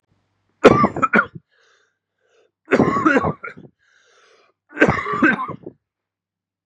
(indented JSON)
{
  "three_cough_length": "6.7 s",
  "three_cough_amplitude": 32768,
  "three_cough_signal_mean_std_ratio": 0.38,
  "survey_phase": "beta (2021-08-13 to 2022-03-07)",
  "age": "18-44",
  "gender": "Male",
  "wearing_mask": "No",
  "symptom_cough_any": true,
  "symptom_runny_or_blocked_nose": true,
  "symptom_shortness_of_breath": true,
  "symptom_fatigue": true,
  "symptom_headache": true,
  "symptom_change_to_sense_of_smell_or_taste": true,
  "smoker_status": "Never smoked",
  "respiratory_condition_asthma": false,
  "respiratory_condition_other": false,
  "recruitment_source": "Test and Trace",
  "submission_delay": "2 days",
  "covid_test_result": "Positive",
  "covid_test_method": "RT-qPCR",
  "covid_ct_value": 19.1,
  "covid_ct_gene": "ORF1ab gene",
  "covid_ct_mean": 19.7,
  "covid_viral_load": "350000 copies/ml",
  "covid_viral_load_category": "Low viral load (10K-1M copies/ml)"
}